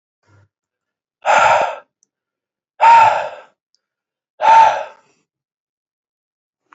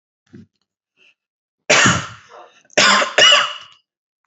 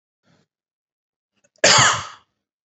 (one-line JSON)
{"exhalation_length": "6.7 s", "exhalation_amplitude": 28334, "exhalation_signal_mean_std_ratio": 0.36, "three_cough_length": "4.3 s", "three_cough_amplitude": 32176, "three_cough_signal_mean_std_ratio": 0.4, "cough_length": "2.6 s", "cough_amplitude": 28965, "cough_signal_mean_std_ratio": 0.3, "survey_phase": "beta (2021-08-13 to 2022-03-07)", "age": "18-44", "gender": "Male", "wearing_mask": "No", "symptom_diarrhoea": true, "smoker_status": "Current smoker (1 to 10 cigarettes per day)", "respiratory_condition_asthma": false, "respiratory_condition_other": false, "recruitment_source": "REACT", "submission_delay": "0 days", "covid_test_result": "Negative", "covid_test_method": "RT-qPCR", "influenza_a_test_result": "Negative", "influenza_b_test_result": "Negative"}